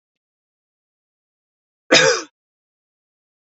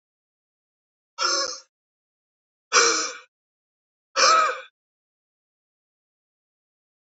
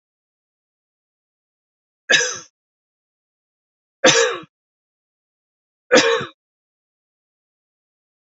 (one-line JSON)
{"cough_length": "3.4 s", "cough_amplitude": 29659, "cough_signal_mean_std_ratio": 0.22, "exhalation_length": "7.1 s", "exhalation_amplitude": 24360, "exhalation_signal_mean_std_ratio": 0.31, "three_cough_length": "8.3 s", "three_cough_amplitude": 31248, "three_cough_signal_mean_std_ratio": 0.24, "survey_phase": "beta (2021-08-13 to 2022-03-07)", "age": "65+", "gender": "Male", "wearing_mask": "No", "symptom_none": true, "smoker_status": "Ex-smoker", "respiratory_condition_asthma": false, "respiratory_condition_other": false, "recruitment_source": "REACT", "submission_delay": "4 days", "covid_test_result": "Negative", "covid_test_method": "RT-qPCR"}